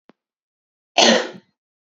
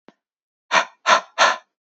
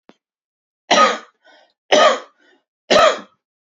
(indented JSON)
{
  "cough_length": "1.9 s",
  "cough_amplitude": 29602,
  "cough_signal_mean_std_ratio": 0.3,
  "exhalation_length": "1.9 s",
  "exhalation_amplitude": 26515,
  "exhalation_signal_mean_std_ratio": 0.38,
  "three_cough_length": "3.8 s",
  "three_cough_amplitude": 28470,
  "three_cough_signal_mean_std_ratio": 0.37,
  "survey_phase": "beta (2021-08-13 to 2022-03-07)",
  "age": "18-44",
  "gender": "Male",
  "wearing_mask": "No",
  "symptom_none": true,
  "smoker_status": "Never smoked",
  "respiratory_condition_asthma": false,
  "respiratory_condition_other": false,
  "recruitment_source": "REACT",
  "submission_delay": "2 days",
  "covid_test_result": "Positive",
  "covid_test_method": "RT-qPCR",
  "covid_ct_value": 36.0,
  "covid_ct_gene": "N gene",
  "influenza_a_test_result": "Negative",
  "influenza_b_test_result": "Negative"
}